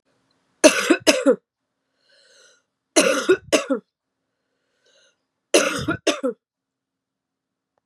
three_cough_length: 7.9 s
three_cough_amplitude: 32767
three_cough_signal_mean_std_ratio: 0.33
survey_phase: beta (2021-08-13 to 2022-03-07)
age: 18-44
gender: Female
wearing_mask: 'No'
symptom_cough_any: true
symptom_runny_or_blocked_nose: true
symptom_fatigue: true
symptom_fever_high_temperature: true
symptom_headache: true
symptom_onset: 2 days
smoker_status: Never smoked
respiratory_condition_asthma: false
respiratory_condition_other: false
recruitment_source: Test and Trace
submission_delay: 2 days
covid_test_result: Positive
covid_test_method: RT-qPCR
covid_ct_value: 21.7
covid_ct_gene: ORF1ab gene
covid_ct_mean: 21.9
covid_viral_load: 65000 copies/ml
covid_viral_load_category: Low viral load (10K-1M copies/ml)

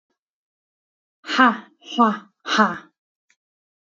exhalation_length: 3.8 s
exhalation_amplitude: 27361
exhalation_signal_mean_std_ratio: 0.33
survey_phase: beta (2021-08-13 to 2022-03-07)
age: 18-44
gender: Female
wearing_mask: 'No'
symptom_headache: true
smoker_status: Never smoked
respiratory_condition_asthma: false
respiratory_condition_other: false
recruitment_source: REACT
submission_delay: 1 day
covid_test_result: Negative
covid_test_method: RT-qPCR
influenza_a_test_result: Negative
influenza_b_test_result: Negative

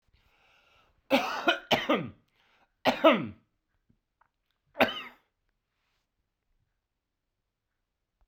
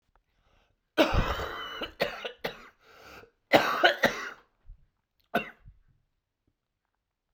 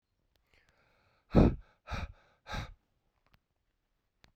three_cough_length: 8.3 s
three_cough_amplitude: 15600
three_cough_signal_mean_std_ratio: 0.27
cough_length: 7.3 s
cough_amplitude: 22469
cough_signal_mean_std_ratio: 0.34
exhalation_length: 4.4 s
exhalation_amplitude: 10445
exhalation_signal_mean_std_ratio: 0.22
survey_phase: beta (2021-08-13 to 2022-03-07)
age: 18-44
gender: Male
wearing_mask: 'No'
symptom_cough_any: true
symptom_runny_or_blocked_nose: true
symptom_shortness_of_breath: true
symptom_sore_throat: true
symptom_fatigue: true
symptom_fever_high_temperature: true
symptom_onset: 3 days
smoker_status: Ex-smoker
respiratory_condition_asthma: false
respiratory_condition_other: false
recruitment_source: Test and Trace
submission_delay: 1 day
covid_test_result: Positive
covid_test_method: RT-qPCR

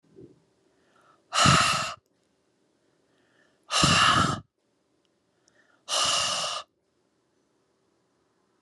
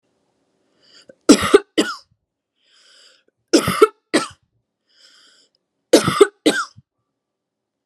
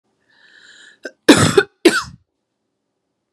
exhalation_length: 8.6 s
exhalation_amplitude: 14796
exhalation_signal_mean_std_ratio: 0.38
three_cough_length: 7.9 s
three_cough_amplitude: 32768
three_cough_signal_mean_std_ratio: 0.27
cough_length: 3.3 s
cough_amplitude: 32768
cough_signal_mean_std_ratio: 0.28
survey_phase: alpha (2021-03-01 to 2021-08-12)
age: 18-44
gender: Female
wearing_mask: 'No'
symptom_none: true
smoker_status: Never smoked
respiratory_condition_asthma: false
respiratory_condition_other: false
recruitment_source: REACT
submission_delay: 1 day
covid_test_result: Negative
covid_test_method: RT-qPCR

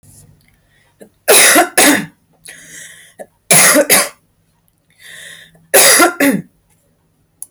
three_cough_length: 7.5 s
three_cough_amplitude: 32768
three_cough_signal_mean_std_ratio: 0.45
survey_phase: beta (2021-08-13 to 2022-03-07)
age: 18-44
gender: Female
wearing_mask: 'No'
symptom_none: true
smoker_status: Never smoked
respiratory_condition_asthma: false
respiratory_condition_other: false
recruitment_source: REACT
submission_delay: 5 days
covid_test_result: Negative
covid_test_method: RT-qPCR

